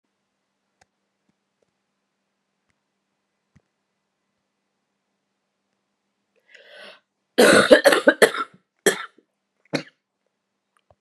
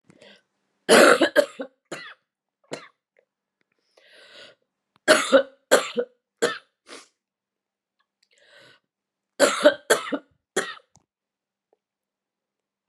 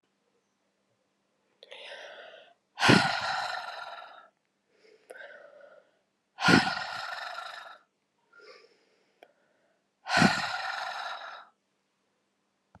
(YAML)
cough_length: 11.0 s
cough_amplitude: 32768
cough_signal_mean_std_ratio: 0.21
three_cough_length: 12.9 s
three_cough_amplitude: 28836
three_cough_signal_mean_std_ratio: 0.27
exhalation_length: 12.8 s
exhalation_amplitude: 20296
exhalation_signal_mean_std_ratio: 0.33
survey_phase: beta (2021-08-13 to 2022-03-07)
age: 45-64
gender: Female
wearing_mask: 'No'
symptom_cough_any: true
symptom_runny_or_blocked_nose: true
symptom_sore_throat: true
symptom_fatigue: true
symptom_headache: true
symptom_change_to_sense_of_smell_or_taste: true
symptom_onset: 3 days
smoker_status: Never smoked
respiratory_condition_asthma: false
respiratory_condition_other: false
recruitment_source: Test and Trace
submission_delay: 2 days
covid_test_result: Positive
covid_test_method: RT-qPCR
covid_ct_value: 15.7
covid_ct_gene: ORF1ab gene
covid_ct_mean: 16.0
covid_viral_load: 5700000 copies/ml
covid_viral_load_category: High viral load (>1M copies/ml)